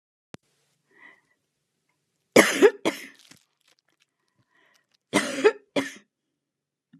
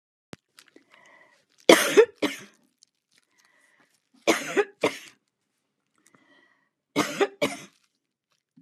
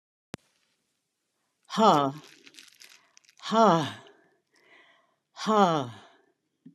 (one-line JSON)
{"cough_length": "7.0 s", "cough_amplitude": 32306, "cough_signal_mean_std_ratio": 0.24, "three_cough_length": "8.6 s", "three_cough_amplitude": 32723, "three_cough_signal_mean_std_ratio": 0.25, "exhalation_length": "6.7 s", "exhalation_amplitude": 15084, "exhalation_signal_mean_std_ratio": 0.31, "survey_phase": "beta (2021-08-13 to 2022-03-07)", "age": "65+", "gender": "Female", "wearing_mask": "No", "symptom_none": true, "smoker_status": "Never smoked", "respiratory_condition_asthma": false, "respiratory_condition_other": false, "recruitment_source": "REACT", "submission_delay": "2 days", "covid_test_result": "Negative", "covid_test_method": "RT-qPCR"}